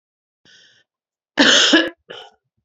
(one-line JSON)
{"cough_length": "2.6 s", "cough_amplitude": 29339, "cough_signal_mean_std_ratio": 0.36, "survey_phase": "beta (2021-08-13 to 2022-03-07)", "age": "45-64", "gender": "Female", "wearing_mask": "No", "symptom_cough_any": true, "symptom_runny_or_blocked_nose": true, "symptom_fatigue": true, "symptom_fever_high_temperature": true, "symptom_headache": true, "symptom_change_to_sense_of_smell_or_taste": true, "symptom_loss_of_taste": true, "symptom_other": true, "symptom_onset": "4 days", "smoker_status": "Ex-smoker", "respiratory_condition_asthma": false, "respiratory_condition_other": false, "recruitment_source": "Test and Trace", "submission_delay": "3 days", "covid_test_result": "Positive", "covid_test_method": "RT-qPCR", "covid_ct_value": 19.5, "covid_ct_gene": "ORF1ab gene", "covid_ct_mean": 19.7, "covid_viral_load": "340000 copies/ml", "covid_viral_load_category": "Low viral load (10K-1M copies/ml)"}